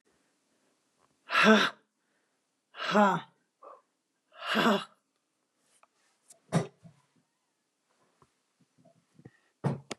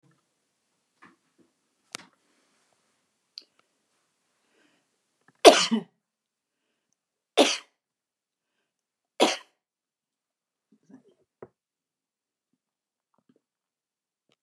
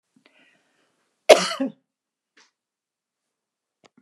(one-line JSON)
{"exhalation_length": "10.0 s", "exhalation_amplitude": 14420, "exhalation_signal_mean_std_ratio": 0.28, "three_cough_length": "14.4 s", "three_cough_amplitude": 32767, "three_cough_signal_mean_std_ratio": 0.14, "cough_length": "4.0 s", "cough_amplitude": 32768, "cough_signal_mean_std_ratio": 0.16, "survey_phase": "beta (2021-08-13 to 2022-03-07)", "age": "65+", "gender": "Female", "wearing_mask": "No", "symptom_cough_any": true, "smoker_status": "Never smoked", "respiratory_condition_asthma": false, "respiratory_condition_other": false, "recruitment_source": "REACT", "submission_delay": "2 days", "covid_test_result": "Negative", "covid_test_method": "RT-qPCR"}